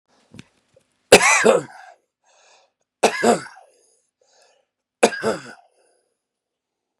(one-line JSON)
{"three_cough_length": "7.0 s", "three_cough_amplitude": 32768, "three_cough_signal_mean_std_ratio": 0.28, "survey_phase": "beta (2021-08-13 to 2022-03-07)", "age": "45-64", "gender": "Male", "wearing_mask": "No", "symptom_none": true, "smoker_status": "Ex-smoker", "respiratory_condition_asthma": true, "respiratory_condition_other": true, "recruitment_source": "REACT", "submission_delay": "6 days", "covid_test_result": "Negative", "covid_test_method": "RT-qPCR", "influenza_a_test_result": "Negative", "influenza_b_test_result": "Negative"}